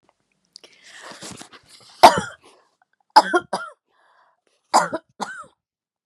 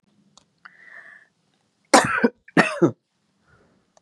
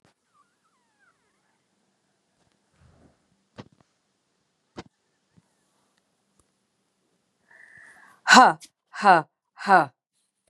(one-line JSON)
{"three_cough_length": "6.1 s", "three_cough_amplitude": 32768, "three_cough_signal_mean_std_ratio": 0.23, "cough_length": "4.0 s", "cough_amplitude": 32767, "cough_signal_mean_std_ratio": 0.28, "exhalation_length": "10.5 s", "exhalation_amplitude": 32519, "exhalation_signal_mean_std_ratio": 0.18, "survey_phase": "beta (2021-08-13 to 2022-03-07)", "age": "45-64", "gender": "Female", "wearing_mask": "No", "symptom_cough_any": true, "symptom_sore_throat": true, "symptom_fatigue": true, "symptom_headache": true, "symptom_onset": "2 days", "smoker_status": "Never smoked", "respiratory_condition_asthma": false, "respiratory_condition_other": false, "recruitment_source": "Test and Trace", "submission_delay": "1 day", "covid_test_result": "Positive", "covid_test_method": "RT-qPCR", "covid_ct_value": 24.9, "covid_ct_gene": "ORF1ab gene", "covid_ct_mean": 25.2, "covid_viral_load": "5600 copies/ml", "covid_viral_load_category": "Minimal viral load (< 10K copies/ml)"}